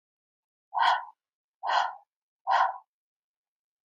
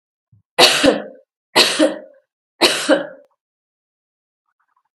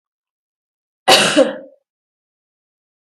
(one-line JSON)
{"exhalation_length": "3.8 s", "exhalation_amplitude": 10349, "exhalation_signal_mean_std_ratio": 0.37, "three_cough_length": "4.9 s", "three_cough_amplitude": 32768, "three_cough_signal_mean_std_ratio": 0.37, "cough_length": "3.1 s", "cough_amplitude": 32768, "cough_signal_mean_std_ratio": 0.29, "survey_phase": "beta (2021-08-13 to 2022-03-07)", "age": "45-64", "gender": "Female", "wearing_mask": "No", "symptom_none": true, "smoker_status": "Never smoked", "respiratory_condition_asthma": false, "respiratory_condition_other": false, "recruitment_source": "REACT", "submission_delay": "2 days", "covid_test_result": "Negative", "covid_test_method": "RT-qPCR", "influenza_a_test_result": "Negative", "influenza_b_test_result": "Negative"}